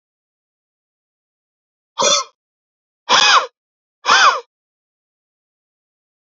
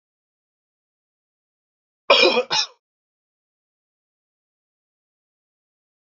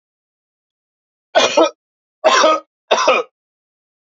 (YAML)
exhalation_length: 6.3 s
exhalation_amplitude: 32768
exhalation_signal_mean_std_ratio: 0.3
cough_length: 6.1 s
cough_amplitude: 28414
cough_signal_mean_std_ratio: 0.21
three_cough_length: 4.0 s
three_cough_amplitude: 30161
three_cough_signal_mean_std_ratio: 0.4
survey_phase: beta (2021-08-13 to 2022-03-07)
age: 45-64
gender: Male
wearing_mask: 'No'
symptom_none: true
smoker_status: Ex-smoker
respiratory_condition_asthma: false
respiratory_condition_other: false
recruitment_source: REACT
submission_delay: 2 days
covid_test_result: Negative
covid_test_method: RT-qPCR
influenza_a_test_result: Negative
influenza_b_test_result: Negative